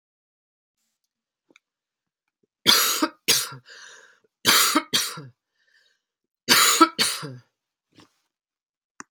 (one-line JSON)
{"three_cough_length": "9.1 s", "three_cough_amplitude": 30817, "three_cough_signal_mean_std_ratio": 0.34, "survey_phase": "alpha (2021-03-01 to 2021-08-12)", "age": "45-64", "gender": "Female", "wearing_mask": "No", "symptom_fatigue": true, "symptom_headache": true, "symptom_onset": "6 days", "smoker_status": "Ex-smoker", "respiratory_condition_asthma": false, "respiratory_condition_other": false, "recruitment_source": "Test and Trace", "submission_delay": "1 day", "covid_test_result": "Positive", "covid_test_method": "RT-qPCR"}